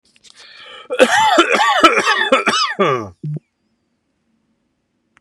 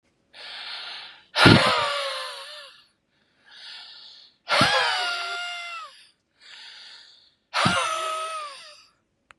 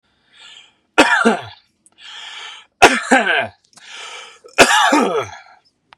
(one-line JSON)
{"cough_length": "5.2 s", "cough_amplitude": 32768, "cough_signal_mean_std_ratio": 0.52, "exhalation_length": "9.4 s", "exhalation_amplitude": 30956, "exhalation_signal_mean_std_ratio": 0.44, "three_cough_length": "6.0 s", "three_cough_amplitude": 32768, "three_cough_signal_mean_std_ratio": 0.43, "survey_phase": "beta (2021-08-13 to 2022-03-07)", "age": "18-44", "gender": "Male", "wearing_mask": "No", "symptom_none": true, "smoker_status": "Ex-smoker", "respiratory_condition_asthma": false, "respiratory_condition_other": false, "recruitment_source": "REACT", "submission_delay": "2 days", "covid_test_result": "Negative", "covid_test_method": "RT-qPCR", "influenza_a_test_result": "Negative", "influenza_b_test_result": "Negative"}